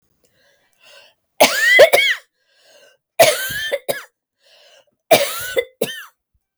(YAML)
three_cough_length: 6.6 s
three_cough_amplitude: 32768
three_cough_signal_mean_std_ratio: 0.38
survey_phase: beta (2021-08-13 to 2022-03-07)
age: 45-64
gender: Female
wearing_mask: 'No'
symptom_none: true
smoker_status: Never smoked
respiratory_condition_asthma: false
respiratory_condition_other: false
recruitment_source: REACT
submission_delay: 2 days
covid_test_result: Negative
covid_test_method: RT-qPCR